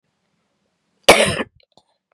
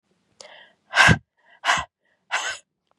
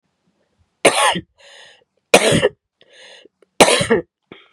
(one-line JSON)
{"cough_length": "2.1 s", "cough_amplitude": 32768, "cough_signal_mean_std_ratio": 0.26, "exhalation_length": "3.0 s", "exhalation_amplitude": 25582, "exhalation_signal_mean_std_ratio": 0.32, "three_cough_length": "4.5 s", "three_cough_amplitude": 32768, "three_cough_signal_mean_std_ratio": 0.36, "survey_phase": "beta (2021-08-13 to 2022-03-07)", "age": "18-44", "gender": "Female", "wearing_mask": "No", "symptom_cough_any": true, "symptom_new_continuous_cough": true, "symptom_runny_or_blocked_nose": true, "symptom_fatigue": true, "symptom_fever_high_temperature": true, "symptom_headache": true, "symptom_other": true, "smoker_status": "Ex-smoker", "respiratory_condition_asthma": true, "respiratory_condition_other": false, "recruitment_source": "Test and Trace", "submission_delay": "2 days", "covid_test_result": "Positive", "covid_test_method": "ePCR"}